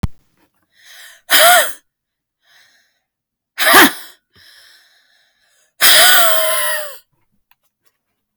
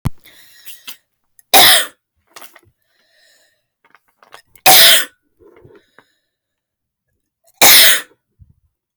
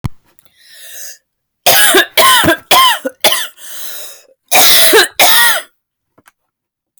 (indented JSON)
{
  "exhalation_length": "8.4 s",
  "exhalation_amplitude": 32768,
  "exhalation_signal_mean_std_ratio": 0.39,
  "three_cough_length": "9.0 s",
  "three_cough_amplitude": 32768,
  "three_cough_signal_mean_std_ratio": 0.31,
  "cough_length": "7.0 s",
  "cough_amplitude": 32768,
  "cough_signal_mean_std_ratio": 0.55,
  "survey_phase": "beta (2021-08-13 to 2022-03-07)",
  "age": "18-44",
  "gender": "Female",
  "wearing_mask": "No",
  "symptom_fatigue": true,
  "symptom_onset": "12 days",
  "smoker_status": "Current smoker (e-cigarettes or vapes only)",
  "respiratory_condition_asthma": true,
  "respiratory_condition_other": false,
  "recruitment_source": "REACT",
  "submission_delay": "1 day",
  "covid_test_result": "Negative",
  "covid_test_method": "RT-qPCR",
  "influenza_a_test_result": "Negative",
  "influenza_b_test_result": "Negative"
}